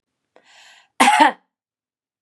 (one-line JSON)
{"cough_length": "2.2 s", "cough_amplitude": 32767, "cough_signal_mean_std_ratio": 0.31, "survey_phase": "beta (2021-08-13 to 2022-03-07)", "age": "18-44", "gender": "Female", "wearing_mask": "No", "symptom_none": true, "symptom_onset": "6 days", "smoker_status": "Never smoked", "respiratory_condition_asthma": false, "respiratory_condition_other": false, "recruitment_source": "REACT", "submission_delay": "1 day", "covid_test_result": "Positive", "covid_test_method": "RT-qPCR", "covid_ct_value": 29.7, "covid_ct_gene": "E gene", "influenza_a_test_result": "Negative", "influenza_b_test_result": "Negative"}